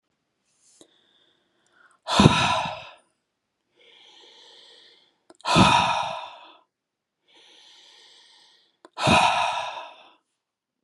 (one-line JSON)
{"exhalation_length": "10.8 s", "exhalation_amplitude": 30816, "exhalation_signal_mean_std_ratio": 0.34, "survey_phase": "beta (2021-08-13 to 2022-03-07)", "age": "45-64", "gender": "Female", "wearing_mask": "No", "symptom_sore_throat": true, "symptom_onset": "9 days", "smoker_status": "Never smoked", "respiratory_condition_asthma": false, "respiratory_condition_other": false, "recruitment_source": "REACT", "submission_delay": "2 days", "covid_test_result": "Negative", "covid_test_method": "RT-qPCR", "influenza_a_test_result": "Negative", "influenza_b_test_result": "Negative"}